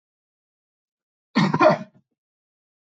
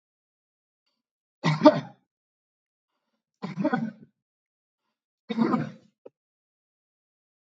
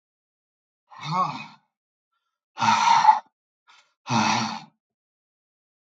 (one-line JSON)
{"cough_length": "3.0 s", "cough_amplitude": 23414, "cough_signal_mean_std_ratio": 0.28, "three_cough_length": "7.4 s", "three_cough_amplitude": 31957, "three_cough_signal_mean_std_ratio": 0.24, "exhalation_length": "5.9 s", "exhalation_amplitude": 24169, "exhalation_signal_mean_std_ratio": 0.37, "survey_phase": "beta (2021-08-13 to 2022-03-07)", "age": "45-64", "gender": "Male", "wearing_mask": "No", "symptom_none": true, "symptom_onset": "2 days", "smoker_status": "Never smoked", "respiratory_condition_asthma": false, "respiratory_condition_other": false, "recruitment_source": "REACT", "submission_delay": "1 day", "covid_test_result": "Negative", "covid_test_method": "RT-qPCR", "influenza_a_test_result": "Negative", "influenza_b_test_result": "Negative"}